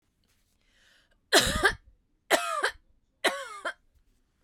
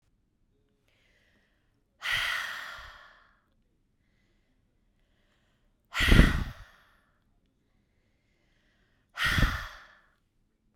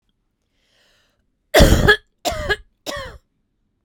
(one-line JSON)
{"three_cough_length": "4.4 s", "three_cough_amplitude": 18447, "three_cough_signal_mean_std_ratio": 0.35, "exhalation_length": "10.8 s", "exhalation_amplitude": 23545, "exhalation_signal_mean_std_ratio": 0.26, "cough_length": "3.8 s", "cough_amplitude": 32768, "cough_signal_mean_std_ratio": 0.32, "survey_phase": "beta (2021-08-13 to 2022-03-07)", "age": "18-44", "gender": "Female", "wearing_mask": "No", "symptom_none": true, "smoker_status": "Ex-smoker", "respiratory_condition_asthma": false, "respiratory_condition_other": false, "recruitment_source": "REACT", "submission_delay": "3 days", "covid_test_result": "Negative", "covid_test_method": "RT-qPCR"}